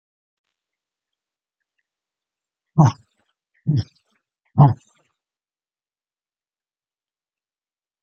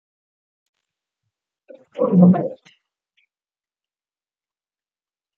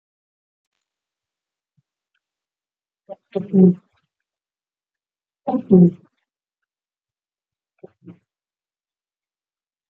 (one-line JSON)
{"exhalation_length": "8.0 s", "exhalation_amplitude": 27521, "exhalation_signal_mean_std_ratio": 0.18, "cough_length": "5.4 s", "cough_amplitude": 22858, "cough_signal_mean_std_ratio": 0.24, "three_cough_length": "9.9 s", "three_cough_amplitude": 27113, "three_cough_signal_mean_std_ratio": 0.19, "survey_phase": "beta (2021-08-13 to 2022-03-07)", "age": "45-64", "gender": "Male", "wearing_mask": "No", "symptom_cough_any": true, "symptom_runny_or_blocked_nose": true, "symptom_headache": true, "smoker_status": "Never smoked", "respiratory_condition_asthma": false, "respiratory_condition_other": false, "recruitment_source": "Test and Trace", "submission_delay": "2 days", "covid_test_result": "Positive", "covid_test_method": "LAMP"}